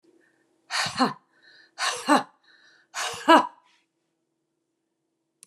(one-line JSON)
{"exhalation_length": "5.5 s", "exhalation_amplitude": 26985, "exhalation_signal_mean_std_ratio": 0.29, "survey_phase": "beta (2021-08-13 to 2022-03-07)", "age": "65+", "gender": "Female", "wearing_mask": "No", "symptom_none": true, "smoker_status": "Never smoked", "respiratory_condition_asthma": false, "respiratory_condition_other": false, "recruitment_source": "REACT", "submission_delay": "2 days", "covid_test_result": "Negative", "covid_test_method": "RT-qPCR", "influenza_a_test_result": "Negative", "influenza_b_test_result": "Negative"}